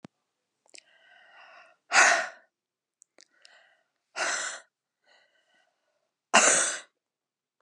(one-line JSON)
{"exhalation_length": "7.6 s", "exhalation_amplitude": 27185, "exhalation_signal_mean_std_ratio": 0.28, "survey_phase": "beta (2021-08-13 to 2022-03-07)", "age": "45-64", "gender": "Female", "wearing_mask": "No", "symptom_fatigue": true, "symptom_change_to_sense_of_smell_or_taste": true, "symptom_loss_of_taste": true, "symptom_onset": "5 days", "smoker_status": "Ex-smoker", "respiratory_condition_asthma": false, "respiratory_condition_other": false, "recruitment_source": "Test and Trace", "submission_delay": "2 days", "covid_test_result": "Positive", "covid_test_method": "RT-qPCR", "covid_ct_value": 18.5, "covid_ct_gene": "ORF1ab gene", "covid_ct_mean": 19.1, "covid_viral_load": "550000 copies/ml", "covid_viral_load_category": "Low viral load (10K-1M copies/ml)"}